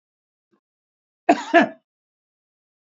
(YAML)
cough_length: 2.9 s
cough_amplitude: 27075
cough_signal_mean_std_ratio: 0.22
survey_phase: beta (2021-08-13 to 2022-03-07)
age: 45-64
gender: Male
wearing_mask: 'No'
symptom_none: true
smoker_status: Ex-smoker
respiratory_condition_asthma: false
respiratory_condition_other: true
recruitment_source: REACT
submission_delay: 1 day
covid_test_result: Negative
covid_test_method: RT-qPCR
influenza_a_test_result: Negative
influenza_b_test_result: Negative